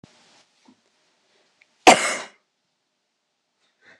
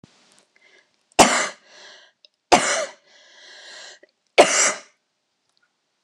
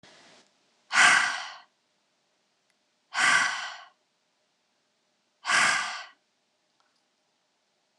{"cough_length": "4.0 s", "cough_amplitude": 26028, "cough_signal_mean_std_ratio": 0.17, "three_cough_length": "6.0 s", "three_cough_amplitude": 26028, "three_cough_signal_mean_std_ratio": 0.3, "exhalation_length": "8.0 s", "exhalation_amplitude": 15718, "exhalation_signal_mean_std_ratio": 0.34, "survey_phase": "beta (2021-08-13 to 2022-03-07)", "age": "18-44", "gender": "Female", "wearing_mask": "No", "symptom_cough_any": true, "symptom_runny_or_blocked_nose": true, "symptom_fatigue": true, "symptom_onset": "9 days", "smoker_status": "Never smoked", "respiratory_condition_asthma": false, "respiratory_condition_other": false, "recruitment_source": "REACT", "submission_delay": "0 days", "covid_test_result": "Negative", "covid_test_method": "RT-qPCR", "influenza_a_test_result": "Negative", "influenza_b_test_result": "Negative"}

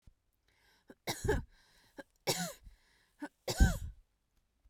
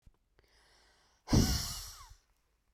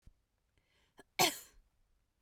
{"three_cough_length": "4.7 s", "three_cough_amplitude": 7529, "three_cough_signal_mean_std_ratio": 0.31, "exhalation_length": "2.7 s", "exhalation_amplitude": 5872, "exhalation_signal_mean_std_ratio": 0.32, "cough_length": "2.2 s", "cough_amplitude": 5732, "cough_signal_mean_std_ratio": 0.21, "survey_phase": "beta (2021-08-13 to 2022-03-07)", "age": "18-44", "gender": "Female", "wearing_mask": "Yes", "symptom_diarrhoea": true, "smoker_status": "Never smoked", "respiratory_condition_asthma": false, "respiratory_condition_other": false, "recruitment_source": "REACT", "submission_delay": "1 day", "covid_test_result": "Negative", "covid_test_method": "RT-qPCR"}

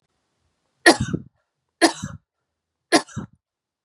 {"three_cough_length": "3.8 s", "three_cough_amplitude": 32674, "three_cough_signal_mean_std_ratio": 0.25, "survey_phase": "beta (2021-08-13 to 2022-03-07)", "age": "45-64", "gender": "Female", "wearing_mask": "No", "symptom_none": true, "smoker_status": "Never smoked", "respiratory_condition_asthma": false, "respiratory_condition_other": false, "recruitment_source": "REACT", "submission_delay": "2 days", "covid_test_result": "Negative", "covid_test_method": "RT-qPCR", "influenza_a_test_result": "Negative", "influenza_b_test_result": "Negative"}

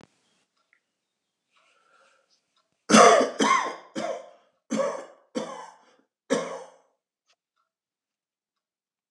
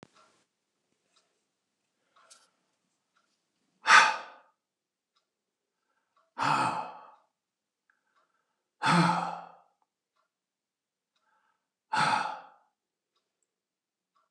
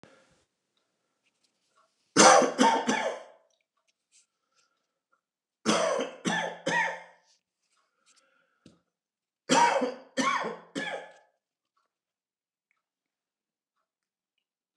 {"cough_length": "9.1 s", "cough_amplitude": 28551, "cough_signal_mean_std_ratio": 0.28, "exhalation_length": "14.3 s", "exhalation_amplitude": 18858, "exhalation_signal_mean_std_ratio": 0.25, "three_cough_length": "14.8 s", "three_cough_amplitude": 22588, "three_cough_signal_mean_std_ratio": 0.32, "survey_phase": "alpha (2021-03-01 to 2021-08-12)", "age": "65+", "gender": "Male", "wearing_mask": "No", "symptom_none": true, "smoker_status": "Ex-smoker", "respiratory_condition_asthma": false, "respiratory_condition_other": false, "recruitment_source": "REACT", "submission_delay": "2 days", "covid_test_result": "Negative", "covid_test_method": "RT-qPCR"}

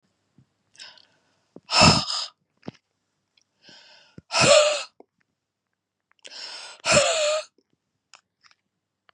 {"exhalation_length": "9.1 s", "exhalation_amplitude": 25526, "exhalation_signal_mean_std_ratio": 0.32, "survey_phase": "beta (2021-08-13 to 2022-03-07)", "age": "45-64", "gender": "Female", "wearing_mask": "No", "symptom_none": true, "smoker_status": "Never smoked", "respiratory_condition_asthma": true, "respiratory_condition_other": false, "recruitment_source": "REACT", "submission_delay": "2 days", "covid_test_result": "Negative", "covid_test_method": "RT-qPCR", "influenza_a_test_result": "Negative", "influenza_b_test_result": "Negative"}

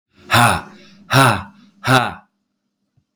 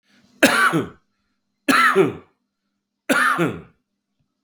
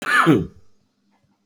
{"exhalation_length": "3.2 s", "exhalation_amplitude": 32766, "exhalation_signal_mean_std_ratio": 0.42, "three_cough_length": "4.4 s", "three_cough_amplitude": 32768, "three_cough_signal_mean_std_ratio": 0.45, "cough_length": "1.5 s", "cough_amplitude": 27198, "cough_signal_mean_std_ratio": 0.44, "survey_phase": "beta (2021-08-13 to 2022-03-07)", "age": "45-64", "gender": "Male", "wearing_mask": "No", "symptom_cough_any": true, "symptom_new_continuous_cough": true, "symptom_runny_or_blocked_nose": true, "symptom_sore_throat": true, "symptom_fatigue": true, "symptom_headache": true, "symptom_change_to_sense_of_smell_or_taste": true, "symptom_onset": "4 days", "smoker_status": "Ex-smoker", "respiratory_condition_asthma": false, "respiratory_condition_other": false, "recruitment_source": "Test and Trace", "submission_delay": "2 days", "covid_test_result": "Positive", "covid_test_method": "RT-qPCR", "covid_ct_value": 23.2, "covid_ct_gene": "ORF1ab gene", "covid_ct_mean": 23.7, "covid_viral_load": "17000 copies/ml", "covid_viral_load_category": "Low viral load (10K-1M copies/ml)"}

